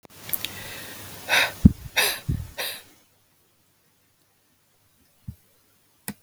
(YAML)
exhalation_length: 6.2 s
exhalation_amplitude: 32768
exhalation_signal_mean_std_ratio: 0.29
survey_phase: beta (2021-08-13 to 2022-03-07)
age: 45-64
gender: Female
wearing_mask: 'No'
symptom_cough_any: true
symptom_new_continuous_cough: true
symptom_runny_or_blocked_nose: true
symptom_shortness_of_breath: true
symptom_sore_throat: true
symptom_abdominal_pain: true
symptom_diarrhoea: true
symptom_fatigue: true
symptom_fever_high_temperature: true
symptom_onset: 17 days
smoker_status: Never smoked
respiratory_condition_asthma: false
respiratory_condition_other: false
recruitment_source: Test and Trace
submission_delay: 15 days
covid_test_result: Negative
covid_test_method: RT-qPCR